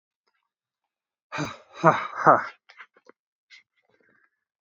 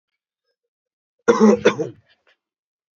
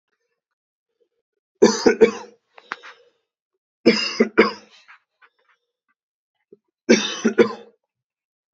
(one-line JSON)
{"exhalation_length": "4.6 s", "exhalation_amplitude": 27554, "exhalation_signal_mean_std_ratio": 0.23, "cough_length": "3.0 s", "cough_amplitude": 27277, "cough_signal_mean_std_ratio": 0.29, "three_cough_length": "8.5 s", "three_cough_amplitude": 29079, "three_cough_signal_mean_std_ratio": 0.28, "survey_phase": "beta (2021-08-13 to 2022-03-07)", "age": "18-44", "gender": "Male", "wearing_mask": "No", "symptom_cough_any": true, "symptom_new_continuous_cough": true, "symptom_runny_or_blocked_nose": true, "symptom_shortness_of_breath": true, "symptom_sore_throat": true, "symptom_fatigue": true, "symptom_fever_high_temperature": true, "symptom_headache": true, "symptom_change_to_sense_of_smell_or_taste": true, "symptom_onset": "4 days", "smoker_status": "Never smoked", "respiratory_condition_asthma": false, "respiratory_condition_other": false, "recruitment_source": "Test and Trace", "submission_delay": "2 days", "covid_test_result": "Positive", "covid_test_method": "ePCR"}